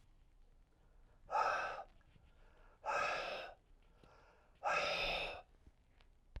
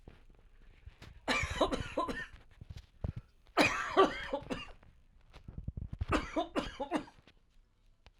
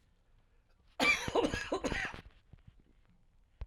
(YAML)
exhalation_length: 6.4 s
exhalation_amplitude: 2022
exhalation_signal_mean_std_ratio: 0.51
three_cough_length: 8.2 s
three_cough_amplitude: 7587
three_cough_signal_mean_std_ratio: 0.45
cough_length: 3.7 s
cough_amplitude: 4784
cough_signal_mean_std_ratio: 0.42
survey_phase: alpha (2021-03-01 to 2021-08-12)
age: 45-64
gender: Male
wearing_mask: 'No'
symptom_cough_any: true
symptom_change_to_sense_of_smell_or_taste: true
symptom_loss_of_taste: true
smoker_status: Never smoked
respiratory_condition_asthma: false
respiratory_condition_other: false
recruitment_source: Test and Trace
submission_delay: 2 days
covid_test_result: Positive
covid_test_method: RT-qPCR
covid_ct_value: 19.3
covid_ct_gene: ORF1ab gene